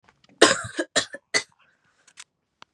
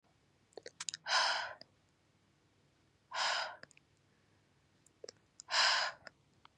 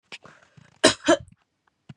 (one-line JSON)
{"three_cough_length": "2.7 s", "three_cough_amplitude": 31715, "three_cough_signal_mean_std_ratio": 0.27, "exhalation_length": "6.6 s", "exhalation_amplitude": 5093, "exhalation_signal_mean_std_ratio": 0.37, "cough_length": "2.0 s", "cough_amplitude": 28964, "cough_signal_mean_std_ratio": 0.26, "survey_phase": "beta (2021-08-13 to 2022-03-07)", "age": "18-44", "gender": "Female", "wearing_mask": "No", "symptom_cough_any": true, "symptom_fatigue": true, "symptom_headache": true, "smoker_status": "Never smoked", "respiratory_condition_asthma": false, "respiratory_condition_other": false, "recruitment_source": "Test and Trace", "submission_delay": "2 days", "covid_test_result": "Positive", "covid_test_method": "LFT"}